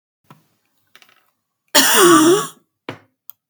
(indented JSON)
{
  "cough_length": "3.5 s",
  "cough_amplitude": 32768,
  "cough_signal_mean_std_ratio": 0.39,
  "survey_phase": "beta (2021-08-13 to 2022-03-07)",
  "age": "45-64",
  "gender": "Female",
  "wearing_mask": "No",
  "symptom_runny_or_blocked_nose": true,
  "symptom_fatigue": true,
  "smoker_status": "Never smoked",
  "respiratory_condition_asthma": false,
  "respiratory_condition_other": false,
  "recruitment_source": "REACT",
  "submission_delay": "1 day",
  "covid_test_result": "Negative",
  "covid_test_method": "RT-qPCR",
  "influenza_a_test_result": "Negative",
  "influenza_b_test_result": "Negative"
}